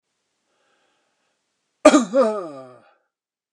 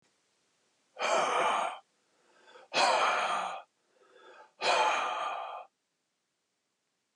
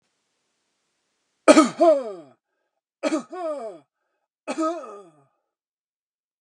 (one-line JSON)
{"cough_length": "3.5 s", "cough_amplitude": 32767, "cough_signal_mean_std_ratio": 0.27, "exhalation_length": "7.2 s", "exhalation_amplitude": 6627, "exhalation_signal_mean_std_ratio": 0.51, "three_cough_length": "6.4 s", "three_cough_amplitude": 32661, "three_cough_signal_mean_std_ratio": 0.29, "survey_phase": "beta (2021-08-13 to 2022-03-07)", "age": "65+", "gender": "Male", "wearing_mask": "No", "symptom_none": true, "smoker_status": "Never smoked", "respiratory_condition_asthma": false, "respiratory_condition_other": false, "recruitment_source": "REACT", "submission_delay": "5 days", "covid_test_result": "Negative", "covid_test_method": "RT-qPCR"}